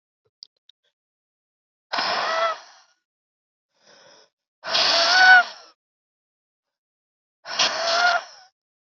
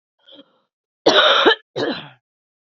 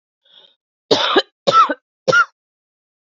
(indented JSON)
{
  "exhalation_length": "9.0 s",
  "exhalation_amplitude": 25460,
  "exhalation_signal_mean_std_ratio": 0.35,
  "cough_length": "2.7 s",
  "cough_amplitude": 29441,
  "cough_signal_mean_std_ratio": 0.4,
  "three_cough_length": "3.1 s",
  "three_cough_amplitude": 28946,
  "three_cough_signal_mean_std_ratio": 0.39,
  "survey_phase": "beta (2021-08-13 to 2022-03-07)",
  "age": "18-44",
  "gender": "Female",
  "wearing_mask": "No",
  "symptom_cough_any": true,
  "symptom_new_continuous_cough": true,
  "symptom_runny_or_blocked_nose": true,
  "symptom_fatigue": true,
  "symptom_onset": "3 days",
  "smoker_status": "Ex-smoker",
  "respiratory_condition_asthma": false,
  "respiratory_condition_other": false,
  "recruitment_source": "Test and Trace",
  "submission_delay": "1 day",
  "covid_test_result": "Positive",
  "covid_test_method": "RT-qPCR",
  "covid_ct_value": 14.5,
  "covid_ct_gene": "ORF1ab gene",
  "covid_ct_mean": 14.6,
  "covid_viral_load": "16000000 copies/ml",
  "covid_viral_load_category": "High viral load (>1M copies/ml)"
}